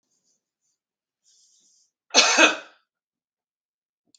{
  "cough_length": "4.2 s",
  "cough_amplitude": 32768,
  "cough_signal_mean_std_ratio": 0.23,
  "survey_phase": "beta (2021-08-13 to 2022-03-07)",
  "age": "45-64",
  "gender": "Male",
  "wearing_mask": "No",
  "symptom_none": true,
  "smoker_status": "Ex-smoker",
  "respiratory_condition_asthma": false,
  "respiratory_condition_other": false,
  "recruitment_source": "REACT",
  "submission_delay": "1 day",
  "covid_test_result": "Negative",
  "covid_test_method": "RT-qPCR",
  "influenza_a_test_result": "Unknown/Void",
  "influenza_b_test_result": "Unknown/Void"
}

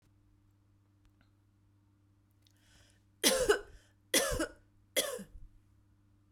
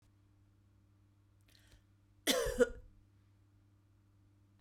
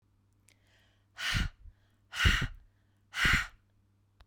{
  "three_cough_length": "6.3 s",
  "three_cough_amplitude": 8524,
  "three_cough_signal_mean_std_ratio": 0.31,
  "cough_length": "4.6 s",
  "cough_amplitude": 5376,
  "cough_signal_mean_std_ratio": 0.26,
  "exhalation_length": "4.3 s",
  "exhalation_amplitude": 8165,
  "exhalation_signal_mean_std_ratio": 0.37,
  "survey_phase": "beta (2021-08-13 to 2022-03-07)",
  "age": "45-64",
  "gender": "Female",
  "wearing_mask": "No",
  "symptom_none": true,
  "smoker_status": "Never smoked",
  "respiratory_condition_asthma": false,
  "respiratory_condition_other": false,
  "recruitment_source": "REACT",
  "submission_delay": "1 day",
  "covid_test_result": "Negative",
  "covid_test_method": "RT-qPCR",
  "influenza_a_test_result": "Negative",
  "influenza_b_test_result": "Negative"
}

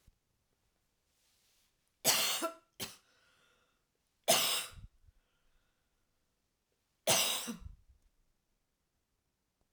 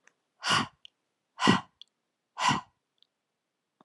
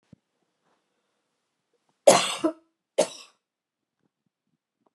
{
  "three_cough_length": "9.7 s",
  "three_cough_amplitude": 8877,
  "three_cough_signal_mean_std_ratio": 0.29,
  "exhalation_length": "3.8 s",
  "exhalation_amplitude": 13094,
  "exhalation_signal_mean_std_ratio": 0.31,
  "cough_length": "4.9 s",
  "cough_amplitude": 26630,
  "cough_signal_mean_std_ratio": 0.2,
  "survey_phase": "alpha (2021-03-01 to 2021-08-12)",
  "age": "45-64",
  "gender": "Female",
  "wearing_mask": "No",
  "symptom_none": true,
  "symptom_onset": "12 days",
  "smoker_status": "Never smoked",
  "respiratory_condition_asthma": false,
  "respiratory_condition_other": false,
  "recruitment_source": "REACT",
  "submission_delay": "5 days",
  "covid_test_result": "Negative",
  "covid_test_method": "RT-qPCR"
}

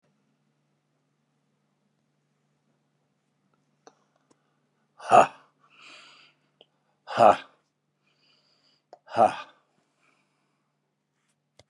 {
  "exhalation_length": "11.7 s",
  "exhalation_amplitude": 25725,
  "exhalation_signal_mean_std_ratio": 0.17,
  "survey_phase": "beta (2021-08-13 to 2022-03-07)",
  "age": "45-64",
  "gender": "Male",
  "wearing_mask": "No",
  "symptom_fatigue": true,
  "smoker_status": "Ex-smoker",
  "respiratory_condition_asthma": false,
  "respiratory_condition_other": false,
  "recruitment_source": "REACT",
  "submission_delay": "1 day",
  "covid_test_result": "Negative",
  "covid_test_method": "RT-qPCR"
}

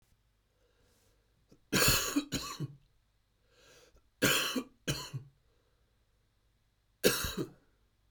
{
  "three_cough_length": "8.1 s",
  "three_cough_amplitude": 9126,
  "three_cough_signal_mean_std_ratio": 0.36,
  "survey_phase": "beta (2021-08-13 to 2022-03-07)",
  "age": "45-64",
  "gender": "Male",
  "wearing_mask": "No",
  "symptom_cough_any": true,
  "symptom_sore_throat": true,
  "symptom_fatigue": true,
  "symptom_headache": true,
  "symptom_onset": "4 days",
  "smoker_status": "Never smoked",
  "respiratory_condition_asthma": false,
  "respiratory_condition_other": false,
  "recruitment_source": "Test and Trace",
  "submission_delay": "2 days",
  "covid_test_result": "Positive",
  "covid_test_method": "RT-qPCR"
}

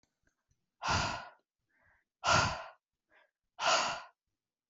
{
  "exhalation_length": "4.7 s",
  "exhalation_amplitude": 6177,
  "exhalation_signal_mean_std_ratio": 0.39,
  "survey_phase": "alpha (2021-03-01 to 2021-08-12)",
  "age": "18-44",
  "gender": "Female",
  "wearing_mask": "No",
  "symptom_none": true,
  "smoker_status": "Never smoked",
  "respiratory_condition_asthma": false,
  "respiratory_condition_other": false,
  "recruitment_source": "Test and Trace",
  "submission_delay": "0 days",
  "covid_test_result": "Negative",
  "covid_test_method": "LFT"
}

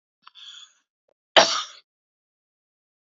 {
  "cough_length": "3.2 s",
  "cough_amplitude": 28262,
  "cough_signal_mean_std_ratio": 0.2,
  "survey_phase": "beta (2021-08-13 to 2022-03-07)",
  "age": "45-64",
  "gender": "Female",
  "wearing_mask": "No",
  "symptom_sore_throat": true,
  "symptom_onset": "12 days",
  "smoker_status": "Ex-smoker",
  "respiratory_condition_asthma": false,
  "respiratory_condition_other": false,
  "recruitment_source": "REACT",
  "submission_delay": "2 days",
  "covid_test_result": "Negative",
  "covid_test_method": "RT-qPCR",
  "influenza_a_test_result": "Negative",
  "influenza_b_test_result": "Negative"
}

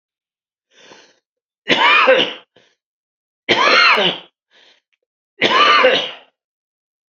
{
  "three_cough_length": "7.1 s",
  "three_cough_amplitude": 32768,
  "three_cough_signal_mean_std_ratio": 0.44,
  "survey_phase": "beta (2021-08-13 to 2022-03-07)",
  "age": "65+",
  "gender": "Male",
  "wearing_mask": "No",
  "symptom_cough_any": true,
  "symptom_shortness_of_breath": true,
  "symptom_onset": "11 days",
  "smoker_status": "Never smoked",
  "respiratory_condition_asthma": true,
  "respiratory_condition_other": false,
  "recruitment_source": "REACT",
  "submission_delay": "3 days",
  "covid_test_result": "Negative",
  "covid_test_method": "RT-qPCR",
  "influenza_a_test_result": "Negative",
  "influenza_b_test_result": "Negative"
}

